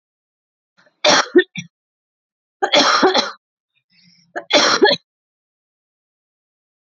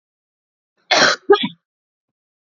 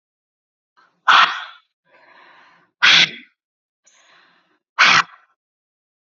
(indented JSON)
{
  "three_cough_length": "7.0 s",
  "three_cough_amplitude": 32408,
  "three_cough_signal_mean_std_ratio": 0.35,
  "cough_length": "2.6 s",
  "cough_amplitude": 28776,
  "cough_signal_mean_std_ratio": 0.3,
  "exhalation_length": "6.1 s",
  "exhalation_amplitude": 32767,
  "exhalation_signal_mean_std_ratio": 0.29,
  "survey_phase": "beta (2021-08-13 to 2022-03-07)",
  "age": "18-44",
  "gender": "Female",
  "wearing_mask": "Yes",
  "symptom_runny_or_blocked_nose": true,
  "symptom_fatigue": true,
  "symptom_fever_high_temperature": true,
  "symptom_headache": true,
  "symptom_change_to_sense_of_smell_or_taste": true,
  "symptom_loss_of_taste": true,
  "smoker_status": "Ex-smoker",
  "respiratory_condition_asthma": false,
  "respiratory_condition_other": false,
  "recruitment_source": "Test and Trace",
  "submission_delay": "2 days",
  "covid_test_result": "Positive",
  "covid_test_method": "RT-qPCR"
}